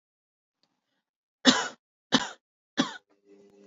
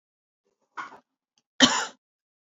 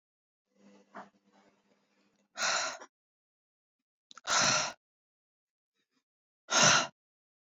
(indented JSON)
{
  "three_cough_length": "3.7 s",
  "three_cough_amplitude": 22459,
  "three_cough_signal_mean_std_ratio": 0.24,
  "cough_length": "2.6 s",
  "cough_amplitude": 31554,
  "cough_signal_mean_std_ratio": 0.22,
  "exhalation_length": "7.6 s",
  "exhalation_amplitude": 10583,
  "exhalation_signal_mean_std_ratio": 0.3,
  "survey_phase": "beta (2021-08-13 to 2022-03-07)",
  "age": "18-44",
  "gender": "Female",
  "wearing_mask": "No",
  "symptom_none": true,
  "smoker_status": "Ex-smoker",
  "respiratory_condition_asthma": false,
  "respiratory_condition_other": false,
  "recruitment_source": "REACT",
  "submission_delay": "2 days",
  "covid_test_result": "Negative",
  "covid_test_method": "RT-qPCR",
  "influenza_a_test_result": "Negative",
  "influenza_b_test_result": "Negative"
}